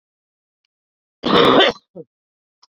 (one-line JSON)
{"cough_length": "2.7 s", "cough_amplitude": 29196, "cough_signal_mean_std_ratio": 0.34, "survey_phase": "beta (2021-08-13 to 2022-03-07)", "age": "18-44", "gender": "Female", "wearing_mask": "No", "symptom_cough_any": true, "symptom_runny_or_blocked_nose": true, "symptom_abdominal_pain": true, "symptom_fatigue": true, "symptom_fever_high_temperature": true, "symptom_change_to_sense_of_smell_or_taste": true, "smoker_status": "Current smoker (1 to 10 cigarettes per day)", "respiratory_condition_asthma": true, "respiratory_condition_other": false, "recruitment_source": "Test and Trace", "submission_delay": "1 day", "covid_test_result": "Positive", "covid_test_method": "RT-qPCR"}